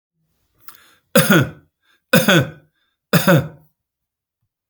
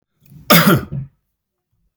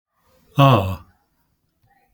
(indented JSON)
{
  "three_cough_length": "4.7 s",
  "three_cough_amplitude": 32768,
  "three_cough_signal_mean_std_ratio": 0.35,
  "cough_length": "2.0 s",
  "cough_amplitude": 32768,
  "cough_signal_mean_std_ratio": 0.36,
  "exhalation_length": "2.1 s",
  "exhalation_amplitude": 30773,
  "exhalation_signal_mean_std_ratio": 0.32,
  "survey_phase": "beta (2021-08-13 to 2022-03-07)",
  "age": "65+",
  "gender": "Male",
  "wearing_mask": "No",
  "symptom_none": true,
  "symptom_onset": "4 days",
  "smoker_status": "Never smoked",
  "respiratory_condition_asthma": false,
  "respiratory_condition_other": false,
  "recruitment_source": "REACT",
  "submission_delay": "2 days",
  "covid_test_result": "Negative",
  "covid_test_method": "RT-qPCR"
}